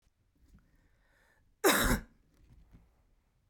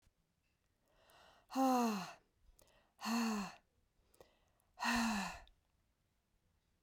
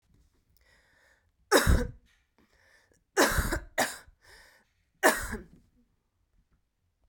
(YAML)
cough_length: 3.5 s
cough_amplitude: 7522
cough_signal_mean_std_ratio: 0.27
exhalation_length: 6.8 s
exhalation_amplitude: 2106
exhalation_signal_mean_std_ratio: 0.41
three_cough_length: 7.1 s
three_cough_amplitude: 14690
three_cough_signal_mean_std_ratio: 0.31
survey_phase: beta (2021-08-13 to 2022-03-07)
age: 18-44
gender: Male
wearing_mask: 'No'
symptom_cough_any: true
symptom_new_continuous_cough: true
symptom_runny_or_blocked_nose: true
symptom_sore_throat: true
symptom_fatigue: true
symptom_headache: true
symptom_onset: 7 days
smoker_status: Never smoked
respiratory_condition_asthma: false
respiratory_condition_other: false
recruitment_source: Test and Trace
submission_delay: 5 days
covid_test_result: Positive
covid_test_method: ePCR